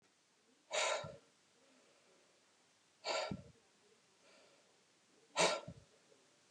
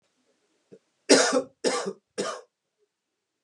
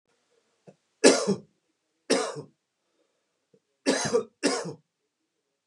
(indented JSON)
{
  "exhalation_length": "6.5 s",
  "exhalation_amplitude": 3150,
  "exhalation_signal_mean_std_ratio": 0.33,
  "cough_length": "3.4 s",
  "cough_amplitude": 25987,
  "cough_signal_mean_std_ratio": 0.33,
  "three_cough_length": "5.7 s",
  "three_cough_amplitude": 26859,
  "three_cough_signal_mean_std_ratio": 0.32,
  "survey_phase": "beta (2021-08-13 to 2022-03-07)",
  "age": "18-44",
  "gender": "Male",
  "wearing_mask": "No",
  "symptom_none": true,
  "smoker_status": "Ex-smoker",
  "respiratory_condition_asthma": false,
  "respiratory_condition_other": false,
  "recruitment_source": "REACT",
  "submission_delay": "1 day",
  "covid_test_result": "Negative",
  "covid_test_method": "RT-qPCR",
  "influenza_a_test_result": "Negative",
  "influenza_b_test_result": "Negative"
}